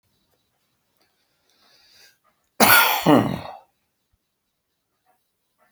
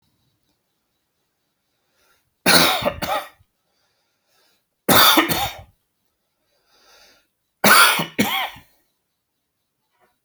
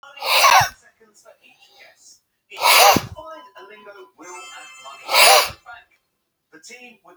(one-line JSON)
{"cough_length": "5.7 s", "cough_amplitude": 32768, "cough_signal_mean_std_ratio": 0.27, "three_cough_length": "10.2 s", "three_cough_amplitude": 32768, "three_cough_signal_mean_std_ratio": 0.32, "exhalation_length": "7.2 s", "exhalation_amplitude": 32768, "exhalation_signal_mean_std_ratio": 0.37, "survey_phase": "beta (2021-08-13 to 2022-03-07)", "age": "45-64", "gender": "Male", "wearing_mask": "No", "symptom_none": true, "smoker_status": "Ex-smoker", "respiratory_condition_asthma": false, "respiratory_condition_other": false, "recruitment_source": "REACT", "submission_delay": "4 days", "covid_test_result": "Negative", "covid_test_method": "RT-qPCR", "influenza_a_test_result": "Unknown/Void", "influenza_b_test_result": "Unknown/Void"}